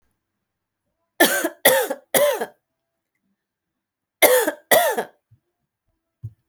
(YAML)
cough_length: 6.5 s
cough_amplitude: 32768
cough_signal_mean_std_ratio: 0.36
survey_phase: alpha (2021-03-01 to 2021-08-12)
age: 18-44
gender: Female
wearing_mask: 'No'
symptom_none: true
symptom_onset: 12 days
smoker_status: Never smoked
respiratory_condition_asthma: false
respiratory_condition_other: false
recruitment_source: REACT
submission_delay: 2 days
covid_test_result: Negative
covid_test_method: RT-qPCR